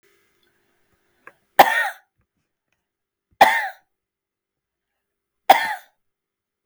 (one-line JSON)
{"three_cough_length": "6.7 s", "three_cough_amplitude": 32768, "three_cough_signal_mean_std_ratio": 0.22, "survey_phase": "beta (2021-08-13 to 2022-03-07)", "age": "65+", "gender": "Female", "wearing_mask": "No", "symptom_none": true, "smoker_status": "Never smoked", "respiratory_condition_asthma": true, "respiratory_condition_other": false, "recruitment_source": "REACT", "submission_delay": "6 days", "covid_test_result": "Negative", "covid_test_method": "RT-qPCR"}